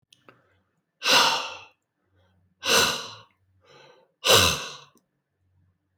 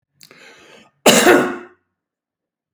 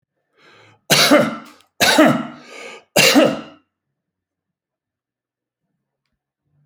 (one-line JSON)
{"exhalation_length": "6.0 s", "exhalation_amplitude": 21631, "exhalation_signal_mean_std_ratio": 0.35, "cough_length": "2.7 s", "cough_amplitude": 31175, "cough_signal_mean_std_ratio": 0.34, "three_cough_length": "6.7 s", "three_cough_amplitude": 32767, "three_cough_signal_mean_std_ratio": 0.36, "survey_phase": "beta (2021-08-13 to 2022-03-07)", "age": "65+", "gender": "Male", "wearing_mask": "No", "symptom_none": true, "smoker_status": "Ex-smoker", "respiratory_condition_asthma": false, "respiratory_condition_other": false, "recruitment_source": "REACT", "submission_delay": "1 day", "covid_test_result": "Negative", "covid_test_method": "RT-qPCR"}